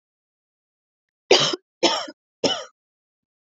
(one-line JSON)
{"three_cough_length": "3.4 s", "three_cough_amplitude": 29102, "three_cough_signal_mean_std_ratio": 0.3, "survey_phase": "beta (2021-08-13 to 2022-03-07)", "age": "18-44", "gender": "Female", "wearing_mask": "No", "symptom_cough_any": true, "symptom_runny_or_blocked_nose": true, "symptom_sore_throat": true, "symptom_onset": "5 days", "smoker_status": "Ex-smoker", "respiratory_condition_asthma": false, "respiratory_condition_other": false, "recruitment_source": "Test and Trace", "submission_delay": "1 day", "covid_test_result": "Positive", "covid_test_method": "RT-qPCR", "covid_ct_value": 26.2, "covid_ct_gene": "ORF1ab gene", "covid_ct_mean": 26.8, "covid_viral_load": "1600 copies/ml", "covid_viral_load_category": "Minimal viral load (< 10K copies/ml)"}